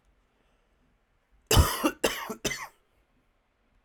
{"cough_length": "3.8 s", "cough_amplitude": 13102, "cough_signal_mean_std_ratio": 0.3, "survey_phase": "alpha (2021-03-01 to 2021-08-12)", "age": "18-44", "gender": "Male", "wearing_mask": "No", "symptom_shortness_of_breath": true, "symptom_change_to_sense_of_smell_or_taste": true, "symptom_loss_of_taste": true, "symptom_onset": "3 days", "smoker_status": "Ex-smoker", "respiratory_condition_asthma": false, "respiratory_condition_other": false, "recruitment_source": "Test and Trace", "submission_delay": "2 days", "covid_test_result": "Positive", "covid_test_method": "RT-qPCR", "covid_ct_value": 10.4, "covid_ct_gene": "N gene", "covid_ct_mean": 10.5, "covid_viral_load": "360000000 copies/ml", "covid_viral_load_category": "High viral load (>1M copies/ml)"}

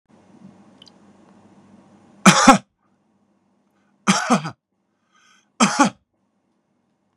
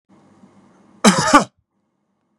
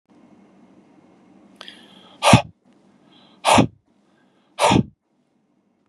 {"three_cough_length": "7.2 s", "three_cough_amplitude": 32768, "three_cough_signal_mean_std_ratio": 0.26, "cough_length": "2.4 s", "cough_amplitude": 32768, "cough_signal_mean_std_ratio": 0.29, "exhalation_length": "5.9 s", "exhalation_amplitude": 32768, "exhalation_signal_mean_std_ratio": 0.27, "survey_phase": "beta (2021-08-13 to 2022-03-07)", "age": "65+", "gender": "Male", "wearing_mask": "No", "symptom_none": true, "symptom_onset": "6 days", "smoker_status": "Never smoked", "respiratory_condition_asthma": false, "respiratory_condition_other": false, "recruitment_source": "REACT", "submission_delay": "2 days", "covid_test_result": "Negative", "covid_test_method": "RT-qPCR", "influenza_a_test_result": "Negative", "influenza_b_test_result": "Negative"}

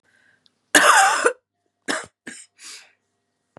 {"cough_length": "3.6 s", "cough_amplitude": 32767, "cough_signal_mean_std_ratio": 0.35, "survey_phase": "beta (2021-08-13 to 2022-03-07)", "age": "18-44", "gender": "Female", "wearing_mask": "No", "symptom_cough_any": true, "symptom_runny_or_blocked_nose": true, "symptom_shortness_of_breath": true, "symptom_sore_throat": true, "symptom_abdominal_pain": true, "symptom_fatigue": true, "symptom_headache": true, "symptom_change_to_sense_of_smell_or_taste": true, "symptom_loss_of_taste": true, "symptom_onset": "6 days", "smoker_status": "Never smoked", "respiratory_condition_asthma": false, "respiratory_condition_other": false, "recruitment_source": "Test and Trace", "submission_delay": "1 day", "covid_test_result": "Positive", "covid_test_method": "RT-qPCR", "covid_ct_value": 16.6, "covid_ct_gene": "ORF1ab gene", "covid_ct_mean": 17.1, "covid_viral_load": "2400000 copies/ml", "covid_viral_load_category": "High viral load (>1M copies/ml)"}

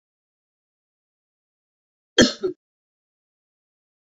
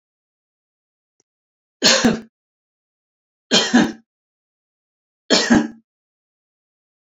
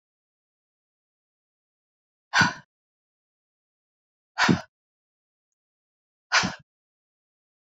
{"cough_length": "4.2 s", "cough_amplitude": 28050, "cough_signal_mean_std_ratio": 0.16, "three_cough_length": "7.2 s", "three_cough_amplitude": 31083, "three_cough_signal_mean_std_ratio": 0.3, "exhalation_length": "7.8 s", "exhalation_amplitude": 15801, "exhalation_signal_mean_std_ratio": 0.21, "survey_phase": "beta (2021-08-13 to 2022-03-07)", "age": "65+", "gender": "Female", "wearing_mask": "No", "symptom_none": true, "smoker_status": "Never smoked", "respiratory_condition_asthma": false, "respiratory_condition_other": false, "recruitment_source": "REACT", "submission_delay": "2 days", "covid_test_result": "Negative", "covid_test_method": "RT-qPCR"}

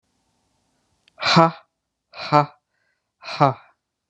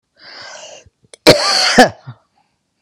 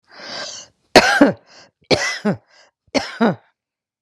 {"exhalation_length": "4.1 s", "exhalation_amplitude": 32112, "exhalation_signal_mean_std_ratio": 0.28, "cough_length": "2.8 s", "cough_amplitude": 32768, "cough_signal_mean_std_ratio": 0.38, "three_cough_length": "4.0 s", "three_cough_amplitude": 32768, "three_cough_signal_mean_std_ratio": 0.38, "survey_phase": "beta (2021-08-13 to 2022-03-07)", "age": "65+", "gender": "Female", "wearing_mask": "No", "symptom_none": true, "smoker_status": "Current smoker (1 to 10 cigarettes per day)", "respiratory_condition_asthma": false, "respiratory_condition_other": false, "recruitment_source": "REACT", "submission_delay": "6 days", "covid_test_result": "Negative", "covid_test_method": "RT-qPCR"}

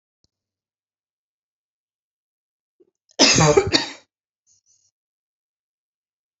{"cough_length": "6.4 s", "cough_amplitude": 30433, "cough_signal_mean_std_ratio": 0.24, "survey_phase": "beta (2021-08-13 to 2022-03-07)", "age": "65+", "gender": "Female", "wearing_mask": "No", "symptom_none": true, "smoker_status": "Ex-smoker", "respiratory_condition_asthma": false, "respiratory_condition_other": false, "recruitment_source": "REACT", "submission_delay": "2 days", "covid_test_result": "Negative", "covid_test_method": "RT-qPCR"}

